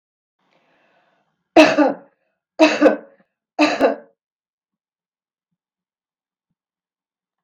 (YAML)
three_cough_length: 7.4 s
three_cough_amplitude: 32768
three_cough_signal_mean_std_ratio: 0.27
survey_phase: beta (2021-08-13 to 2022-03-07)
age: 65+
gender: Female
wearing_mask: 'No'
symptom_none: true
smoker_status: Ex-smoker
respiratory_condition_asthma: false
respiratory_condition_other: false
recruitment_source: REACT
submission_delay: 1 day
covid_test_result: Negative
covid_test_method: RT-qPCR
influenza_a_test_result: Negative
influenza_b_test_result: Negative